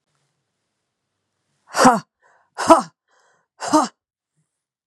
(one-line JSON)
{"exhalation_length": "4.9 s", "exhalation_amplitude": 32768, "exhalation_signal_mean_std_ratio": 0.26, "survey_phase": "beta (2021-08-13 to 2022-03-07)", "age": "45-64", "gender": "Female", "wearing_mask": "No", "symptom_cough_any": true, "symptom_runny_or_blocked_nose": true, "symptom_fatigue": true, "symptom_headache": true, "symptom_onset": "1 day", "smoker_status": "Never smoked", "respiratory_condition_asthma": true, "respiratory_condition_other": false, "recruitment_source": "Test and Trace", "submission_delay": "0 days", "covid_test_result": "Negative", "covid_test_method": "RT-qPCR"}